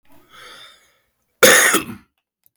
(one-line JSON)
{"cough_length": "2.6 s", "cough_amplitude": 32768, "cough_signal_mean_std_ratio": 0.33, "survey_phase": "beta (2021-08-13 to 2022-03-07)", "age": "65+", "gender": "Male", "wearing_mask": "No", "symptom_runny_or_blocked_nose": true, "symptom_other": true, "smoker_status": "Current smoker (1 to 10 cigarettes per day)", "respiratory_condition_asthma": false, "respiratory_condition_other": false, "recruitment_source": "REACT", "submission_delay": "3 days", "covid_test_result": "Negative", "covid_test_method": "RT-qPCR", "influenza_a_test_result": "Negative", "influenza_b_test_result": "Negative"}